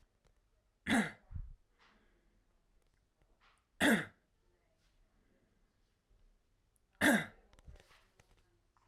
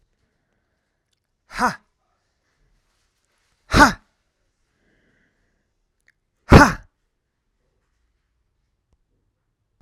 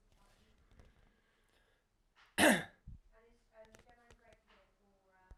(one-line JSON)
{"three_cough_length": "8.9 s", "three_cough_amplitude": 4517, "three_cough_signal_mean_std_ratio": 0.25, "exhalation_length": "9.8 s", "exhalation_amplitude": 32768, "exhalation_signal_mean_std_ratio": 0.17, "cough_length": "5.4 s", "cough_amplitude": 5478, "cough_signal_mean_std_ratio": 0.2, "survey_phase": "alpha (2021-03-01 to 2021-08-12)", "age": "18-44", "gender": "Male", "wearing_mask": "No", "symptom_none": true, "smoker_status": "Ex-smoker", "respiratory_condition_asthma": false, "respiratory_condition_other": false, "recruitment_source": "REACT", "submission_delay": "3 days", "covid_test_result": "Negative", "covid_test_method": "RT-qPCR"}